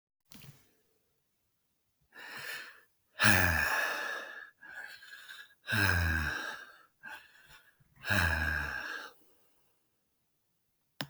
{
  "exhalation_length": "11.1 s",
  "exhalation_amplitude": 12165,
  "exhalation_signal_mean_std_ratio": 0.43,
  "survey_phase": "beta (2021-08-13 to 2022-03-07)",
  "age": "45-64",
  "gender": "Male",
  "wearing_mask": "No",
  "symptom_none": true,
  "smoker_status": "Never smoked",
  "respiratory_condition_asthma": false,
  "respiratory_condition_other": false,
  "recruitment_source": "REACT",
  "submission_delay": "1 day",
  "covid_test_result": "Negative",
  "covid_test_method": "RT-qPCR",
  "influenza_a_test_result": "Negative",
  "influenza_b_test_result": "Negative"
}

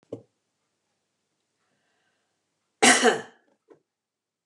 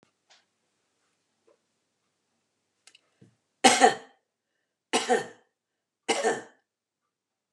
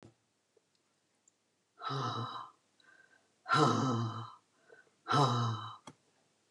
{
  "cough_length": "4.5 s",
  "cough_amplitude": 21291,
  "cough_signal_mean_std_ratio": 0.22,
  "three_cough_length": "7.5 s",
  "three_cough_amplitude": 22495,
  "three_cough_signal_mean_std_ratio": 0.23,
  "exhalation_length": "6.5 s",
  "exhalation_amplitude": 5518,
  "exhalation_signal_mean_std_ratio": 0.43,
  "survey_phase": "beta (2021-08-13 to 2022-03-07)",
  "age": "65+",
  "gender": "Female",
  "wearing_mask": "No",
  "symptom_none": true,
  "smoker_status": "Never smoked",
  "respiratory_condition_asthma": false,
  "respiratory_condition_other": false,
  "recruitment_source": "REACT",
  "submission_delay": "1 day",
  "covid_test_result": "Negative",
  "covid_test_method": "RT-qPCR",
  "influenza_a_test_result": "Negative",
  "influenza_b_test_result": "Negative"
}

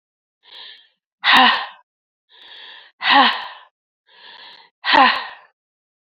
{
  "exhalation_length": "6.1 s",
  "exhalation_amplitude": 29537,
  "exhalation_signal_mean_std_ratio": 0.36,
  "survey_phase": "beta (2021-08-13 to 2022-03-07)",
  "age": "45-64",
  "gender": "Female",
  "wearing_mask": "No",
  "symptom_cough_any": true,
  "symptom_new_continuous_cough": true,
  "symptom_runny_or_blocked_nose": true,
  "symptom_shortness_of_breath": true,
  "symptom_sore_throat": true,
  "symptom_diarrhoea": true,
  "symptom_fatigue": true,
  "symptom_fever_high_temperature": true,
  "symptom_headache": true,
  "symptom_change_to_sense_of_smell_or_taste": true,
  "symptom_loss_of_taste": true,
  "symptom_other": true,
  "symptom_onset": "4 days",
  "smoker_status": "Ex-smoker",
  "respiratory_condition_asthma": false,
  "respiratory_condition_other": false,
  "recruitment_source": "Test and Trace",
  "submission_delay": "3 days",
  "covid_test_result": "Positive",
  "covid_test_method": "RT-qPCR",
  "covid_ct_value": 16.2,
  "covid_ct_gene": "ORF1ab gene",
  "covid_ct_mean": 16.9,
  "covid_viral_load": "3000000 copies/ml",
  "covid_viral_load_category": "High viral load (>1M copies/ml)"
}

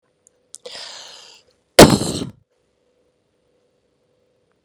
{
  "cough_length": "4.6 s",
  "cough_amplitude": 32768,
  "cough_signal_mean_std_ratio": 0.19,
  "survey_phase": "beta (2021-08-13 to 2022-03-07)",
  "age": "45-64",
  "gender": "Female",
  "wearing_mask": "No",
  "symptom_none": true,
  "smoker_status": "Ex-smoker",
  "respiratory_condition_asthma": false,
  "respiratory_condition_other": false,
  "recruitment_source": "REACT",
  "submission_delay": "1 day",
  "covid_test_result": "Negative",
  "covid_test_method": "RT-qPCR",
  "influenza_a_test_result": "Negative",
  "influenza_b_test_result": "Negative"
}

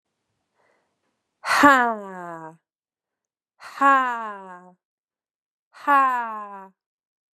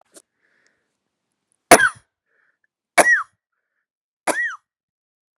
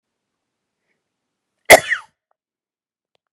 {
  "exhalation_length": "7.3 s",
  "exhalation_amplitude": 30843,
  "exhalation_signal_mean_std_ratio": 0.34,
  "three_cough_length": "5.4 s",
  "three_cough_amplitude": 32768,
  "three_cough_signal_mean_std_ratio": 0.24,
  "cough_length": "3.3 s",
  "cough_amplitude": 32768,
  "cough_signal_mean_std_ratio": 0.16,
  "survey_phase": "beta (2021-08-13 to 2022-03-07)",
  "age": "18-44",
  "gender": "Female",
  "wearing_mask": "No",
  "symptom_none": true,
  "symptom_onset": "12 days",
  "smoker_status": "Never smoked",
  "respiratory_condition_asthma": false,
  "respiratory_condition_other": false,
  "recruitment_source": "REACT",
  "submission_delay": "1 day",
  "covid_test_result": "Negative",
  "covid_test_method": "RT-qPCR",
  "influenza_a_test_result": "Unknown/Void",
  "influenza_b_test_result": "Unknown/Void"
}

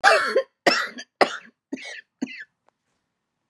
{
  "cough_length": "3.5 s",
  "cough_amplitude": 29149,
  "cough_signal_mean_std_ratio": 0.37,
  "survey_phase": "beta (2021-08-13 to 2022-03-07)",
  "age": "45-64",
  "gender": "Female",
  "wearing_mask": "No",
  "symptom_shortness_of_breath": true,
  "symptom_diarrhoea": true,
  "symptom_fatigue": true,
  "symptom_headache": true,
  "symptom_change_to_sense_of_smell_or_taste": true,
  "symptom_loss_of_taste": true,
  "symptom_onset": "382 days",
  "smoker_status": "Never smoked",
  "respiratory_condition_asthma": true,
  "respiratory_condition_other": false,
  "recruitment_source": "Test and Trace",
  "submission_delay": "3 days",
  "covid_test_result": "Negative",
  "covid_test_method": "RT-qPCR"
}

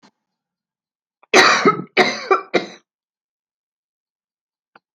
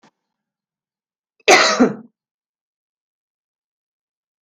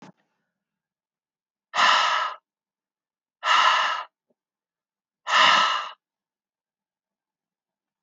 {
  "three_cough_length": "4.9 s",
  "three_cough_amplitude": 30533,
  "three_cough_signal_mean_std_ratio": 0.31,
  "cough_length": "4.4 s",
  "cough_amplitude": 32393,
  "cough_signal_mean_std_ratio": 0.24,
  "exhalation_length": "8.0 s",
  "exhalation_amplitude": 17499,
  "exhalation_signal_mean_std_ratio": 0.37,
  "survey_phase": "alpha (2021-03-01 to 2021-08-12)",
  "age": "65+",
  "gender": "Female",
  "wearing_mask": "No",
  "symptom_none": true,
  "smoker_status": "Never smoked",
  "respiratory_condition_asthma": false,
  "respiratory_condition_other": false,
  "recruitment_source": "REACT",
  "submission_delay": "2 days",
  "covid_test_result": "Negative",
  "covid_test_method": "RT-qPCR"
}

